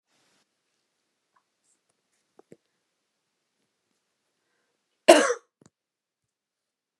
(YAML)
cough_length: 7.0 s
cough_amplitude: 29204
cough_signal_mean_std_ratio: 0.13
survey_phase: alpha (2021-03-01 to 2021-08-12)
age: 45-64
gender: Female
wearing_mask: 'No'
symptom_none: true
smoker_status: Never smoked
respiratory_condition_asthma: false
respiratory_condition_other: false
recruitment_source: REACT
submission_delay: 1 day
covid_test_result: Negative
covid_test_method: RT-qPCR